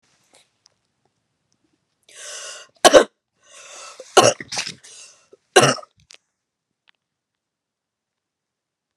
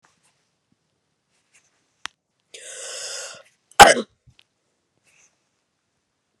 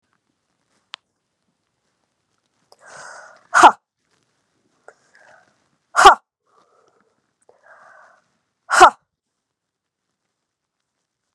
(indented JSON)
{
  "three_cough_length": "9.0 s",
  "three_cough_amplitude": 32768,
  "three_cough_signal_mean_std_ratio": 0.21,
  "cough_length": "6.4 s",
  "cough_amplitude": 32768,
  "cough_signal_mean_std_ratio": 0.15,
  "exhalation_length": "11.3 s",
  "exhalation_amplitude": 32768,
  "exhalation_signal_mean_std_ratio": 0.17,
  "survey_phase": "beta (2021-08-13 to 2022-03-07)",
  "age": "18-44",
  "gender": "Female",
  "wearing_mask": "No",
  "symptom_fatigue": true,
  "symptom_headache": true,
  "symptom_change_to_sense_of_smell_or_taste": true,
  "smoker_status": "Never smoked",
  "respiratory_condition_asthma": false,
  "respiratory_condition_other": false,
  "recruitment_source": "Test and Trace",
  "submission_delay": "2 days",
  "covid_test_result": "Positive",
  "covid_test_method": "LAMP"
}